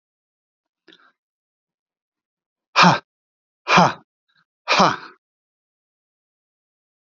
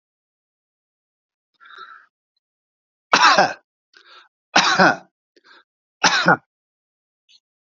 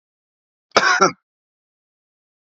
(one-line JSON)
{"exhalation_length": "7.1 s", "exhalation_amplitude": 31769, "exhalation_signal_mean_std_ratio": 0.24, "three_cough_length": "7.7 s", "three_cough_amplitude": 30681, "three_cough_signal_mean_std_ratio": 0.29, "cough_length": "2.5 s", "cough_amplitude": 32767, "cough_signal_mean_std_ratio": 0.28, "survey_phase": "beta (2021-08-13 to 2022-03-07)", "age": "45-64", "gender": "Male", "wearing_mask": "No", "symptom_none": true, "smoker_status": "Never smoked", "respiratory_condition_asthma": true, "respiratory_condition_other": false, "recruitment_source": "REACT", "submission_delay": "1 day", "covid_test_result": "Negative", "covid_test_method": "RT-qPCR"}